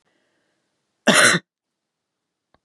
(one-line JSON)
{"cough_length": "2.6 s", "cough_amplitude": 31168, "cough_signal_mean_std_ratio": 0.27, "survey_phase": "beta (2021-08-13 to 2022-03-07)", "age": "45-64", "gender": "Female", "wearing_mask": "No", "symptom_cough_any": true, "symptom_runny_or_blocked_nose": true, "symptom_fatigue": true, "symptom_other": true, "symptom_onset": "2 days", "smoker_status": "Never smoked", "respiratory_condition_asthma": false, "respiratory_condition_other": false, "recruitment_source": "Test and Trace", "submission_delay": "1 day", "covid_test_result": "Positive", "covid_test_method": "RT-qPCR", "covid_ct_value": 17.0, "covid_ct_gene": "ORF1ab gene", "covid_ct_mean": 17.4, "covid_viral_load": "1900000 copies/ml", "covid_viral_load_category": "High viral load (>1M copies/ml)"}